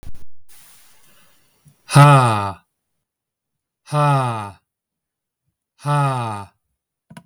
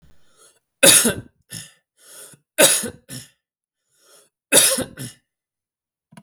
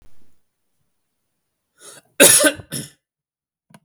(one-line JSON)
{"exhalation_length": "7.3 s", "exhalation_amplitude": 32766, "exhalation_signal_mean_std_ratio": 0.38, "three_cough_length": "6.2 s", "three_cough_amplitude": 32768, "three_cough_signal_mean_std_ratio": 0.31, "cough_length": "3.8 s", "cough_amplitude": 32768, "cough_signal_mean_std_ratio": 0.26, "survey_phase": "alpha (2021-03-01 to 2021-08-12)", "age": "18-44", "gender": "Male", "wearing_mask": "No", "symptom_none": true, "smoker_status": "Never smoked", "respiratory_condition_asthma": false, "respiratory_condition_other": false, "recruitment_source": "REACT", "submission_delay": "2 days", "covid_test_result": "Negative", "covid_test_method": "RT-qPCR"}